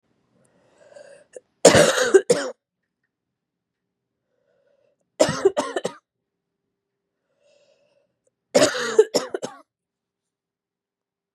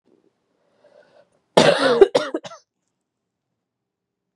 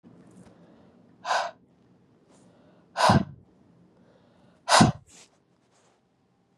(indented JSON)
{
  "three_cough_length": "11.3 s",
  "three_cough_amplitude": 32768,
  "three_cough_signal_mean_std_ratio": 0.27,
  "cough_length": "4.4 s",
  "cough_amplitude": 32767,
  "cough_signal_mean_std_ratio": 0.28,
  "exhalation_length": "6.6 s",
  "exhalation_amplitude": 20223,
  "exhalation_signal_mean_std_ratio": 0.26,
  "survey_phase": "beta (2021-08-13 to 2022-03-07)",
  "age": "18-44",
  "gender": "Female",
  "wearing_mask": "No",
  "symptom_cough_any": true,
  "symptom_new_continuous_cough": true,
  "symptom_runny_or_blocked_nose": true,
  "symptom_shortness_of_breath": true,
  "symptom_sore_throat": true,
  "symptom_fatigue": true,
  "symptom_fever_high_temperature": true,
  "symptom_headache": true,
  "symptom_change_to_sense_of_smell_or_taste": true,
  "symptom_loss_of_taste": true,
  "smoker_status": "Never smoked",
  "respiratory_condition_asthma": false,
  "respiratory_condition_other": false,
  "recruitment_source": "Test and Trace",
  "submission_delay": "2 days",
  "covid_test_result": "Positive",
  "covid_test_method": "LFT"
}